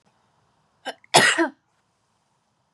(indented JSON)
{
  "cough_length": "2.7 s",
  "cough_amplitude": 30790,
  "cough_signal_mean_std_ratio": 0.27,
  "survey_phase": "beta (2021-08-13 to 2022-03-07)",
  "age": "18-44",
  "gender": "Female",
  "wearing_mask": "No",
  "symptom_none": true,
  "symptom_onset": "5 days",
  "smoker_status": "Never smoked",
  "respiratory_condition_asthma": false,
  "respiratory_condition_other": false,
  "recruitment_source": "REACT",
  "submission_delay": "2 days",
  "covid_test_result": "Negative",
  "covid_test_method": "RT-qPCR",
  "influenza_a_test_result": "Negative",
  "influenza_b_test_result": "Negative"
}